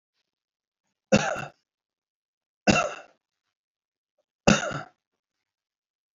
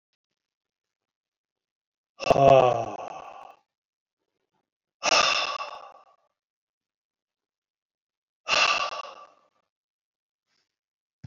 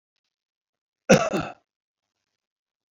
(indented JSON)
{
  "three_cough_length": "6.1 s",
  "three_cough_amplitude": 23621,
  "three_cough_signal_mean_std_ratio": 0.24,
  "exhalation_length": "11.3 s",
  "exhalation_amplitude": 18169,
  "exhalation_signal_mean_std_ratio": 0.28,
  "cough_length": "2.9 s",
  "cough_amplitude": 25390,
  "cough_signal_mean_std_ratio": 0.22,
  "survey_phase": "beta (2021-08-13 to 2022-03-07)",
  "age": "65+",
  "gender": "Male",
  "wearing_mask": "No",
  "symptom_none": true,
  "smoker_status": "Ex-smoker",
  "respiratory_condition_asthma": false,
  "respiratory_condition_other": false,
  "recruitment_source": "REACT",
  "submission_delay": "4 days",
  "covid_test_result": "Negative",
  "covid_test_method": "RT-qPCR",
  "influenza_a_test_result": "Negative",
  "influenza_b_test_result": "Negative"
}